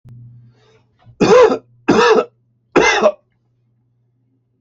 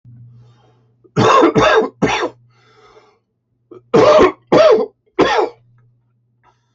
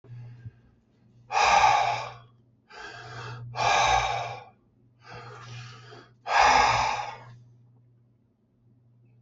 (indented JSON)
{
  "three_cough_length": "4.6 s",
  "three_cough_amplitude": 30616,
  "three_cough_signal_mean_std_ratio": 0.42,
  "cough_length": "6.7 s",
  "cough_amplitude": 27742,
  "cough_signal_mean_std_ratio": 0.47,
  "exhalation_length": "9.2 s",
  "exhalation_amplitude": 13367,
  "exhalation_signal_mean_std_ratio": 0.46,
  "survey_phase": "alpha (2021-03-01 to 2021-08-12)",
  "age": "65+",
  "gender": "Male",
  "wearing_mask": "No",
  "symptom_none": true,
  "smoker_status": "Ex-smoker",
  "respiratory_condition_asthma": false,
  "respiratory_condition_other": false,
  "recruitment_source": "REACT",
  "submission_delay": "1 day",
  "covid_test_result": "Negative",
  "covid_test_method": "RT-qPCR"
}